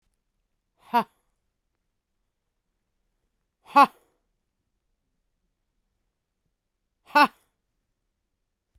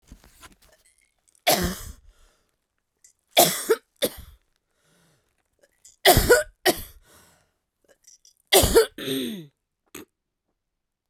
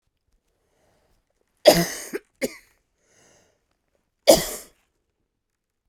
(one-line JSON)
{"exhalation_length": "8.8 s", "exhalation_amplitude": 18093, "exhalation_signal_mean_std_ratio": 0.15, "three_cough_length": "11.1 s", "three_cough_amplitude": 29096, "three_cough_signal_mean_std_ratio": 0.3, "cough_length": "5.9 s", "cough_amplitude": 32768, "cough_signal_mean_std_ratio": 0.21, "survey_phase": "beta (2021-08-13 to 2022-03-07)", "age": "18-44", "gender": "Female", "wearing_mask": "No", "symptom_cough_any": true, "symptom_runny_or_blocked_nose": true, "symptom_sore_throat": true, "symptom_diarrhoea": true, "symptom_fatigue": true, "symptom_fever_high_temperature": true, "symptom_headache": true, "symptom_other": true, "symptom_onset": "5 days", "smoker_status": "Never smoked", "respiratory_condition_asthma": false, "respiratory_condition_other": false, "recruitment_source": "Test and Trace", "submission_delay": "3 days", "covid_test_result": "Positive", "covid_test_method": "LAMP"}